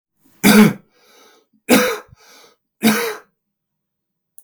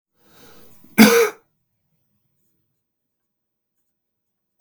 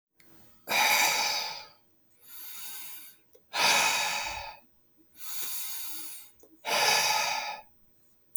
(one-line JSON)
{"three_cough_length": "4.4 s", "three_cough_amplitude": 32766, "three_cough_signal_mean_std_ratio": 0.35, "cough_length": "4.6 s", "cough_amplitude": 32768, "cough_signal_mean_std_ratio": 0.21, "exhalation_length": "8.4 s", "exhalation_amplitude": 8725, "exhalation_signal_mean_std_ratio": 0.58, "survey_phase": "beta (2021-08-13 to 2022-03-07)", "age": "18-44", "gender": "Male", "wearing_mask": "No", "symptom_cough_any": true, "symptom_sore_throat": true, "symptom_onset": "2 days", "smoker_status": "Never smoked", "respiratory_condition_asthma": false, "respiratory_condition_other": false, "recruitment_source": "Test and Trace", "submission_delay": "1 day", "covid_test_result": "Positive", "covid_test_method": "RT-qPCR", "covid_ct_value": 29.9, "covid_ct_gene": "ORF1ab gene"}